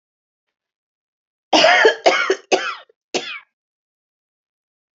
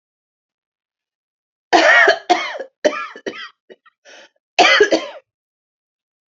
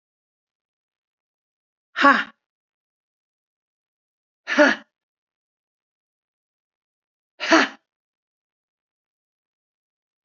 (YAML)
three_cough_length: 4.9 s
three_cough_amplitude: 28410
three_cough_signal_mean_std_ratio: 0.35
cough_length: 6.3 s
cough_amplitude: 29453
cough_signal_mean_std_ratio: 0.36
exhalation_length: 10.2 s
exhalation_amplitude: 27736
exhalation_signal_mean_std_ratio: 0.19
survey_phase: beta (2021-08-13 to 2022-03-07)
age: 45-64
gender: Female
wearing_mask: 'No'
symptom_cough_any: true
symptom_runny_or_blocked_nose: true
symptom_onset: 12 days
smoker_status: Never smoked
respiratory_condition_asthma: true
respiratory_condition_other: false
recruitment_source: REACT
submission_delay: 1 day
covid_test_result: Negative
covid_test_method: RT-qPCR